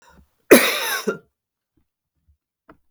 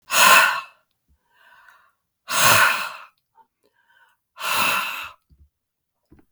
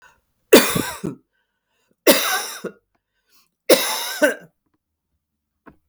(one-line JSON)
{"cough_length": "2.9 s", "cough_amplitude": 32768, "cough_signal_mean_std_ratio": 0.27, "exhalation_length": "6.3 s", "exhalation_amplitude": 32766, "exhalation_signal_mean_std_ratio": 0.39, "three_cough_length": "5.9 s", "three_cough_amplitude": 32768, "three_cough_signal_mean_std_ratio": 0.33, "survey_phase": "beta (2021-08-13 to 2022-03-07)", "age": "45-64", "gender": "Female", "wearing_mask": "No", "symptom_cough_any": true, "smoker_status": "Never smoked", "respiratory_condition_asthma": false, "respiratory_condition_other": true, "recruitment_source": "REACT", "submission_delay": "4 days", "covid_test_result": "Negative", "covid_test_method": "RT-qPCR", "influenza_a_test_result": "Negative", "influenza_b_test_result": "Negative"}